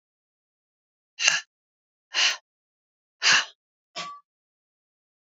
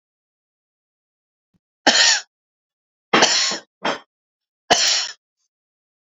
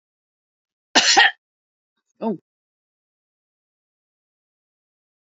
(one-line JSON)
{"exhalation_length": "5.2 s", "exhalation_amplitude": 28986, "exhalation_signal_mean_std_ratio": 0.28, "three_cough_length": "6.1 s", "three_cough_amplitude": 30942, "three_cough_signal_mean_std_ratio": 0.35, "cough_length": "5.4 s", "cough_amplitude": 30986, "cough_signal_mean_std_ratio": 0.21, "survey_phase": "beta (2021-08-13 to 2022-03-07)", "age": "65+", "gender": "Female", "wearing_mask": "No", "symptom_none": true, "smoker_status": "Never smoked", "respiratory_condition_asthma": false, "respiratory_condition_other": false, "recruitment_source": "REACT", "submission_delay": "1 day", "covid_test_result": "Negative", "covid_test_method": "RT-qPCR"}